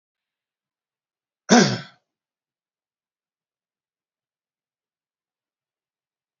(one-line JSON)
{"cough_length": "6.4 s", "cough_amplitude": 28894, "cough_signal_mean_std_ratio": 0.15, "survey_phase": "alpha (2021-03-01 to 2021-08-12)", "age": "18-44", "gender": "Male", "wearing_mask": "No", "symptom_none": true, "smoker_status": "Never smoked", "respiratory_condition_asthma": false, "respiratory_condition_other": false, "recruitment_source": "REACT", "submission_delay": "1 day", "covid_test_result": "Negative", "covid_test_method": "RT-qPCR"}